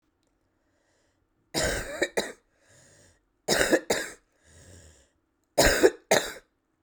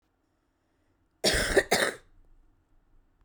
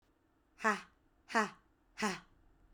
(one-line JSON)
{"three_cough_length": "6.8 s", "three_cough_amplitude": 20306, "three_cough_signal_mean_std_ratio": 0.35, "cough_length": "3.2 s", "cough_amplitude": 12680, "cough_signal_mean_std_ratio": 0.34, "exhalation_length": "2.7 s", "exhalation_amplitude": 5183, "exhalation_signal_mean_std_ratio": 0.32, "survey_phase": "beta (2021-08-13 to 2022-03-07)", "age": "18-44", "gender": "Female", "wearing_mask": "No", "symptom_runny_or_blocked_nose": true, "symptom_fatigue": true, "symptom_headache": true, "smoker_status": "Current smoker (1 to 10 cigarettes per day)", "respiratory_condition_asthma": false, "respiratory_condition_other": false, "recruitment_source": "Test and Trace", "submission_delay": "2 days", "covid_test_result": "Positive", "covid_test_method": "RT-qPCR"}